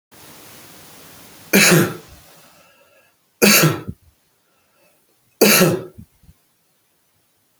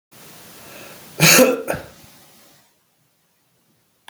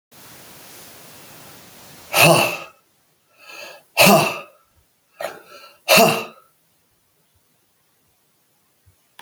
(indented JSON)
{
  "three_cough_length": "7.6 s",
  "three_cough_amplitude": 32768,
  "three_cough_signal_mean_std_ratio": 0.33,
  "cough_length": "4.1 s",
  "cough_amplitude": 32768,
  "cough_signal_mean_std_ratio": 0.3,
  "exhalation_length": "9.2 s",
  "exhalation_amplitude": 32768,
  "exhalation_signal_mean_std_ratio": 0.3,
  "survey_phase": "beta (2021-08-13 to 2022-03-07)",
  "age": "45-64",
  "gender": "Male",
  "wearing_mask": "No",
  "symptom_cough_any": true,
  "symptom_fatigue": true,
  "symptom_change_to_sense_of_smell_or_taste": true,
  "symptom_loss_of_taste": true,
  "smoker_status": "Ex-smoker",
  "respiratory_condition_asthma": false,
  "respiratory_condition_other": false,
  "recruitment_source": "Test and Trace",
  "submission_delay": "1 day",
  "covid_test_result": "Positive",
  "covid_test_method": "RT-qPCR"
}